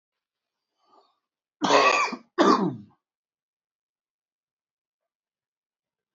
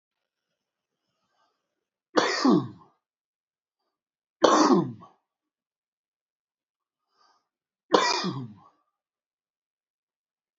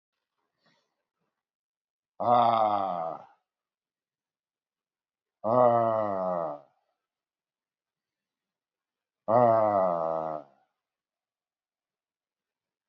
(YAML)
cough_length: 6.1 s
cough_amplitude: 18521
cough_signal_mean_std_ratio: 0.29
three_cough_length: 10.6 s
three_cough_amplitude: 27800
three_cough_signal_mean_std_ratio: 0.27
exhalation_length: 12.9 s
exhalation_amplitude: 11518
exhalation_signal_mean_std_ratio: 0.37
survey_phase: beta (2021-08-13 to 2022-03-07)
age: 45-64
gender: Male
wearing_mask: 'No'
symptom_cough_any: true
symptom_runny_or_blocked_nose: true
smoker_status: Ex-smoker
respiratory_condition_asthma: false
respiratory_condition_other: true
recruitment_source: REACT
submission_delay: 1 day
covid_test_result: Negative
covid_test_method: RT-qPCR
influenza_a_test_result: Negative
influenza_b_test_result: Negative